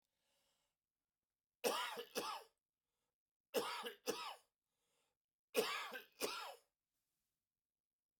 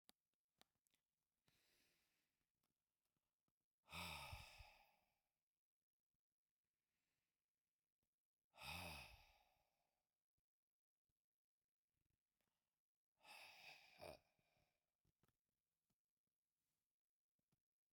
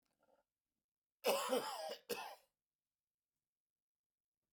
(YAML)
three_cough_length: 8.2 s
three_cough_amplitude: 2127
three_cough_signal_mean_std_ratio: 0.37
exhalation_length: 17.9 s
exhalation_amplitude: 292
exhalation_signal_mean_std_ratio: 0.27
cough_length: 4.5 s
cough_amplitude: 2450
cough_signal_mean_std_ratio: 0.33
survey_phase: beta (2021-08-13 to 2022-03-07)
age: 65+
gender: Male
wearing_mask: 'No'
symptom_none: true
symptom_onset: 10 days
smoker_status: Never smoked
respiratory_condition_asthma: false
respiratory_condition_other: false
recruitment_source: REACT
submission_delay: 1 day
covid_test_result: Negative
covid_test_method: RT-qPCR
influenza_a_test_result: Negative
influenza_b_test_result: Negative